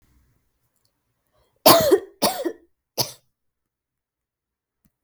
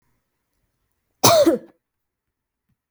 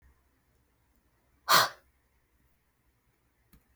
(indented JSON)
{
  "three_cough_length": "5.0 s",
  "three_cough_amplitude": 32768,
  "three_cough_signal_mean_std_ratio": 0.26,
  "cough_length": "2.9 s",
  "cough_amplitude": 32768,
  "cough_signal_mean_std_ratio": 0.28,
  "exhalation_length": "3.8 s",
  "exhalation_amplitude": 11448,
  "exhalation_signal_mean_std_ratio": 0.19,
  "survey_phase": "beta (2021-08-13 to 2022-03-07)",
  "age": "18-44",
  "gender": "Female",
  "wearing_mask": "No",
  "symptom_runny_or_blocked_nose": true,
  "symptom_shortness_of_breath": true,
  "symptom_other": true,
  "symptom_onset": "11 days",
  "smoker_status": "Never smoked",
  "respiratory_condition_asthma": false,
  "respiratory_condition_other": false,
  "recruitment_source": "REACT",
  "submission_delay": "9 days",
  "covid_test_result": "Negative",
  "covid_test_method": "RT-qPCR",
  "influenza_a_test_result": "Negative",
  "influenza_b_test_result": "Negative"
}